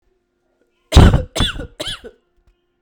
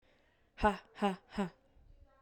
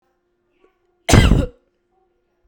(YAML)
three_cough_length: 2.8 s
three_cough_amplitude: 32768
three_cough_signal_mean_std_ratio: 0.32
exhalation_length: 2.2 s
exhalation_amplitude: 5181
exhalation_signal_mean_std_ratio: 0.35
cough_length: 2.5 s
cough_amplitude: 32768
cough_signal_mean_std_ratio: 0.3
survey_phase: beta (2021-08-13 to 2022-03-07)
age: 18-44
gender: Female
wearing_mask: 'No'
symptom_sore_throat: true
smoker_status: Never smoked
respiratory_condition_asthma: false
respiratory_condition_other: false
recruitment_source: Test and Trace
submission_delay: 2 days
covid_test_result: Positive
covid_test_method: RT-qPCR
covid_ct_value: 25.6
covid_ct_gene: ORF1ab gene
covid_ct_mean: 26.2
covid_viral_load: 2600 copies/ml
covid_viral_load_category: Minimal viral load (< 10K copies/ml)